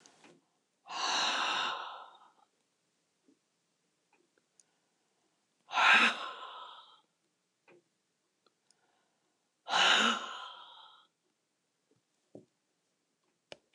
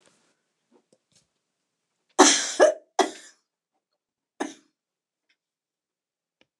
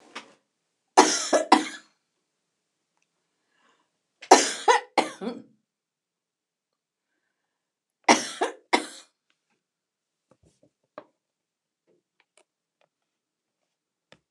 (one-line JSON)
{"exhalation_length": "13.7 s", "exhalation_amplitude": 8590, "exhalation_signal_mean_std_ratio": 0.31, "cough_length": "6.6 s", "cough_amplitude": 28805, "cough_signal_mean_std_ratio": 0.22, "three_cough_length": "14.3 s", "three_cough_amplitude": 29098, "three_cough_signal_mean_std_ratio": 0.21, "survey_phase": "beta (2021-08-13 to 2022-03-07)", "age": "65+", "gender": "Female", "wearing_mask": "No", "symptom_fatigue": true, "symptom_headache": true, "smoker_status": "Never smoked", "respiratory_condition_asthma": false, "respiratory_condition_other": false, "recruitment_source": "REACT", "submission_delay": "2 days", "covid_test_result": "Negative", "covid_test_method": "RT-qPCR"}